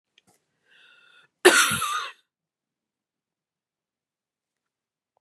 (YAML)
cough_length: 5.2 s
cough_amplitude: 29949
cough_signal_mean_std_ratio: 0.22
survey_phase: beta (2021-08-13 to 2022-03-07)
age: 18-44
gender: Female
wearing_mask: 'No'
symptom_cough_any: true
symptom_runny_or_blocked_nose: true
symptom_abdominal_pain: true
symptom_fever_high_temperature: true
symptom_headache: true
smoker_status: Ex-smoker
respiratory_condition_asthma: false
respiratory_condition_other: false
recruitment_source: Test and Trace
submission_delay: 2 days
covid_test_result: Positive
covid_test_method: RT-qPCR
covid_ct_value: 15.8
covid_ct_gene: ORF1ab gene
covid_ct_mean: 18.1
covid_viral_load: 1200000 copies/ml
covid_viral_load_category: High viral load (>1M copies/ml)